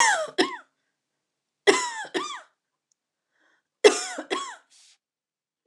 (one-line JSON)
{"three_cough_length": "5.7 s", "three_cough_amplitude": 27242, "three_cough_signal_mean_std_ratio": 0.32, "survey_phase": "beta (2021-08-13 to 2022-03-07)", "age": "45-64", "gender": "Female", "wearing_mask": "No", "symptom_cough_any": true, "symptom_fatigue": true, "symptom_onset": "5 days", "smoker_status": "Never smoked", "respiratory_condition_asthma": false, "respiratory_condition_other": false, "recruitment_source": "REACT", "submission_delay": "4 days", "covid_test_result": "Negative", "covid_test_method": "RT-qPCR", "influenza_a_test_result": "Negative", "influenza_b_test_result": "Negative"}